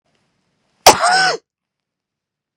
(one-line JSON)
{"cough_length": "2.6 s", "cough_amplitude": 32768, "cough_signal_mean_std_ratio": 0.31, "survey_phase": "beta (2021-08-13 to 2022-03-07)", "age": "45-64", "gender": "Female", "wearing_mask": "No", "symptom_none": true, "smoker_status": "Never smoked", "respiratory_condition_asthma": false, "respiratory_condition_other": true, "recruitment_source": "REACT", "submission_delay": "2 days", "covid_test_result": "Negative", "covid_test_method": "RT-qPCR", "influenza_a_test_result": "Negative", "influenza_b_test_result": "Negative"}